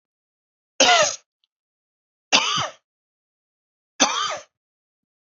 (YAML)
three_cough_length: 5.3 s
three_cough_amplitude: 30395
three_cough_signal_mean_std_ratio: 0.32
survey_phase: beta (2021-08-13 to 2022-03-07)
age: 45-64
gender: Male
wearing_mask: 'No'
symptom_sore_throat: true
smoker_status: Never smoked
respiratory_condition_asthma: false
respiratory_condition_other: false
recruitment_source: Test and Trace
submission_delay: 1 day
covid_test_result: Positive
covid_test_method: ePCR